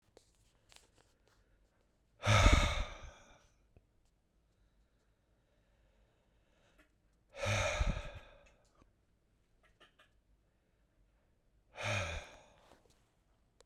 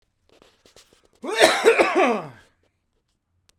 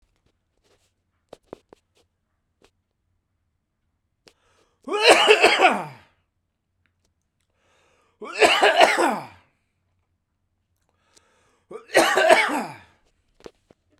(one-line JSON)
{"exhalation_length": "13.7 s", "exhalation_amplitude": 8320, "exhalation_signal_mean_std_ratio": 0.27, "cough_length": "3.6 s", "cough_amplitude": 32767, "cough_signal_mean_std_ratio": 0.39, "three_cough_length": "14.0 s", "three_cough_amplitude": 32767, "three_cough_signal_mean_std_ratio": 0.32, "survey_phase": "beta (2021-08-13 to 2022-03-07)", "age": "45-64", "gender": "Male", "wearing_mask": "No", "symptom_cough_any": true, "symptom_runny_or_blocked_nose": true, "symptom_headache": true, "smoker_status": "Never smoked", "respiratory_condition_asthma": false, "respiratory_condition_other": false, "recruitment_source": "REACT", "submission_delay": "3 days", "covid_test_result": "Negative", "covid_test_method": "RT-qPCR", "influenza_a_test_result": "Unknown/Void", "influenza_b_test_result": "Unknown/Void"}